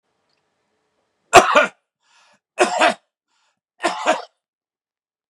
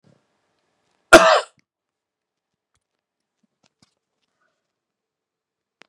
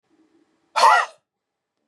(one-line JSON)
{"three_cough_length": "5.3 s", "three_cough_amplitude": 32768, "three_cough_signal_mean_std_ratio": 0.29, "cough_length": "5.9 s", "cough_amplitude": 32768, "cough_signal_mean_std_ratio": 0.16, "exhalation_length": "1.9 s", "exhalation_amplitude": 24043, "exhalation_signal_mean_std_ratio": 0.31, "survey_phase": "beta (2021-08-13 to 2022-03-07)", "age": "45-64", "gender": "Male", "wearing_mask": "No", "symptom_cough_any": true, "symptom_sore_throat": true, "symptom_onset": "12 days", "smoker_status": "Ex-smoker", "respiratory_condition_asthma": false, "respiratory_condition_other": false, "recruitment_source": "REACT", "submission_delay": "2 days", "covid_test_result": "Negative", "covid_test_method": "RT-qPCR", "influenza_a_test_result": "Negative", "influenza_b_test_result": "Negative"}